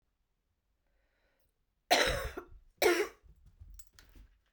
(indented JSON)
{
  "cough_length": "4.5 s",
  "cough_amplitude": 8093,
  "cough_signal_mean_std_ratio": 0.32,
  "survey_phase": "beta (2021-08-13 to 2022-03-07)",
  "age": "18-44",
  "gender": "Female",
  "wearing_mask": "No",
  "symptom_cough_any": true,
  "symptom_new_continuous_cough": true,
  "symptom_runny_or_blocked_nose": true,
  "symptom_shortness_of_breath": true,
  "symptom_fatigue": true,
  "symptom_change_to_sense_of_smell_or_taste": true,
  "symptom_loss_of_taste": true,
  "smoker_status": "Never smoked",
  "respiratory_condition_asthma": false,
  "respiratory_condition_other": false,
  "recruitment_source": "Test and Trace",
  "submission_delay": "3 days",
  "covid_test_result": "Positive",
  "covid_test_method": "RT-qPCR",
  "covid_ct_value": 26.5,
  "covid_ct_gene": "ORF1ab gene",
  "covid_ct_mean": 27.2,
  "covid_viral_load": "1200 copies/ml",
  "covid_viral_load_category": "Minimal viral load (< 10K copies/ml)"
}